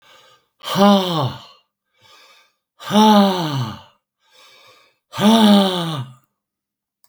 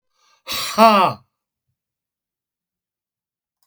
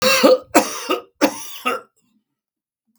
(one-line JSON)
{"exhalation_length": "7.1 s", "exhalation_amplitude": 32768, "exhalation_signal_mean_std_ratio": 0.45, "cough_length": "3.7 s", "cough_amplitude": 32768, "cough_signal_mean_std_ratio": 0.28, "three_cough_length": "3.0 s", "three_cough_amplitude": 32768, "three_cough_signal_mean_std_ratio": 0.44, "survey_phase": "beta (2021-08-13 to 2022-03-07)", "age": "65+", "gender": "Male", "wearing_mask": "No", "symptom_none": true, "smoker_status": "Ex-smoker", "respiratory_condition_asthma": false, "respiratory_condition_other": false, "recruitment_source": "REACT", "submission_delay": "9 days", "covid_test_result": "Negative", "covid_test_method": "RT-qPCR", "influenza_a_test_result": "Negative", "influenza_b_test_result": "Negative"}